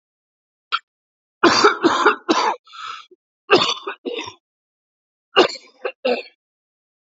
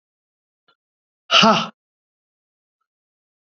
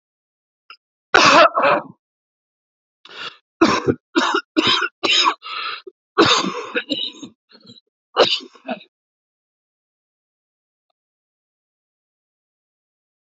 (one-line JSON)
{"three_cough_length": "7.2 s", "three_cough_amplitude": 28739, "three_cough_signal_mean_std_ratio": 0.38, "exhalation_length": "3.5 s", "exhalation_amplitude": 32241, "exhalation_signal_mean_std_ratio": 0.23, "cough_length": "13.2 s", "cough_amplitude": 32767, "cough_signal_mean_std_ratio": 0.35, "survey_phase": "beta (2021-08-13 to 2022-03-07)", "age": "45-64", "gender": "Male", "wearing_mask": "No", "symptom_new_continuous_cough": true, "symptom_runny_or_blocked_nose": true, "symptom_diarrhoea": true, "symptom_headache": true, "symptom_onset": "2 days", "smoker_status": "Never smoked", "respiratory_condition_asthma": true, "respiratory_condition_other": false, "recruitment_source": "Test and Trace", "submission_delay": "1 day", "covid_test_result": "Positive", "covid_test_method": "RT-qPCR"}